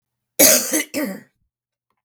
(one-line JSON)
{"cough_length": "2.0 s", "cough_amplitude": 32768, "cough_signal_mean_std_ratio": 0.39, "survey_phase": "beta (2021-08-13 to 2022-03-07)", "age": "45-64", "gender": "Female", "wearing_mask": "No", "symptom_cough_any": true, "symptom_onset": "8 days", "smoker_status": "Never smoked", "respiratory_condition_asthma": false, "respiratory_condition_other": false, "recruitment_source": "REACT", "submission_delay": "1 day", "covid_test_result": "Negative", "covid_test_method": "RT-qPCR", "influenza_a_test_result": "Negative", "influenza_b_test_result": "Negative"}